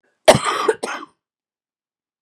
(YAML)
cough_length: 2.2 s
cough_amplitude: 32768
cough_signal_mean_std_ratio: 0.3
survey_phase: beta (2021-08-13 to 2022-03-07)
age: 45-64
gender: Female
wearing_mask: 'No'
symptom_none: true
smoker_status: Never smoked
respiratory_condition_asthma: true
respiratory_condition_other: true
recruitment_source: REACT
submission_delay: 2 days
covid_test_result: Negative
covid_test_method: RT-qPCR
influenza_a_test_result: Negative
influenza_b_test_result: Negative